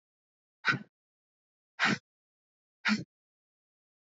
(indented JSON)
{
  "exhalation_length": "4.0 s",
  "exhalation_amplitude": 7281,
  "exhalation_signal_mean_std_ratio": 0.26,
  "survey_phase": "beta (2021-08-13 to 2022-03-07)",
  "age": "18-44",
  "gender": "Female",
  "wearing_mask": "No",
  "symptom_cough_any": true,
  "symptom_runny_or_blocked_nose": true,
  "symptom_sore_throat": true,
  "symptom_fatigue": true,
  "symptom_headache": true,
  "smoker_status": "Never smoked",
  "respiratory_condition_asthma": true,
  "respiratory_condition_other": false,
  "recruitment_source": "Test and Trace",
  "submission_delay": "1 day",
  "covid_test_result": "Positive",
  "covid_test_method": "ePCR"
}